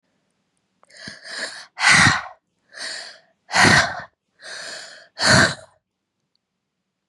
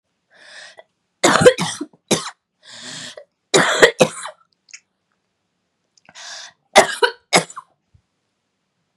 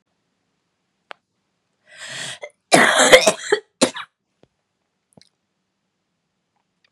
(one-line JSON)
{"exhalation_length": "7.1 s", "exhalation_amplitude": 31979, "exhalation_signal_mean_std_ratio": 0.37, "three_cough_length": "9.0 s", "three_cough_amplitude": 32768, "three_cough_signal_mean_std_ratio": 0.3, "cough_length": "6.9 s", "cough_amplitude": 32768, "cough_signal_mean_std_ratio": 0.26, "survey_phase": "beta (2021-08-13 to 2022-03-07)", "age": "18-44", "gender": "Female", "wearing_mask": "No", "symptom_cough_any": true, "symptom_runny_or_blocked_nose": true, "symptom_sore_throat": true, "symptom_headache": true, "symptom_other": true, "smoker_status": "Never smoked", "respiratory_condition_asthma": false, "respiratory_condition_other": false, "recruitment_source": "Test and Trace", "submission_delay": "1 day", "covid_test_result": "Positive", "covid_test_method": "LFT"}